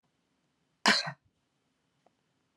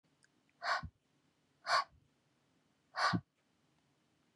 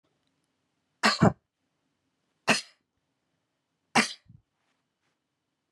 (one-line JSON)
{"cough_length": "2.6 s", "cough_amplitude": 12605, "cough_signal_mean_std_ratio": 0.21, "exhalation_length": "4.4 s", "exhalation_amplitude": 3927, "exhalation_signal_mean_std_ratio": 0.3, "three_cough_length": "5.7 s", "three_cough_amplitude": 17280, "three_cough_signal_mean_std_ratio": 0.21, "survey_phase": "beta (2021-08-13 to 2022-03-07)", "age": "45-64", "gender": "Female", "wearing_mask": "No", "symptom_none": true, "smoker_status": "Never smoked", "respiratory_condition_asthma": false, "respiratory_condition_other": false, "recruitment_source": "REACT", "submission_delay": "3 days", "covid_test_result": "Negative", "covid_test_method": "RT-qPCR", "influenza_a_test_result": "Negative", "influenza_b_test_result": "Negative"}